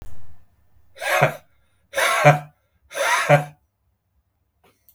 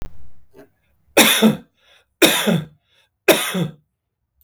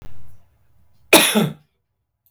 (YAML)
exhalation_length: 4.9 s
exhalation_amplitude: 32768
exhalation_signal_mean_std_ratio: 0.42
three_cough_length: 4.4 s
three_cough_amplitude: 32768
three_cough_signal_mean_std_ratio: 0.43
cough_length: 2.3 s
cough_amplitude: 32768
cough_signal_mean_std_ratio: 0.39
survey_phase: beta (2021-08-13 to 2022-03-07)
age: 45-64
gender: Male
wearing_mask: 'No'
symptom_none: true
smoker_status: Ex-smoker
respiratory_condition_asthma: false
respiratory_condition_other: false
recruitment_source: REACT
submission_delay: 5 days
covid_test_result: Negative
covid_test_method: RT-qPCR
influenza_a_test_result: Unknown/Void
influenza_b_test_result: Unknown/Void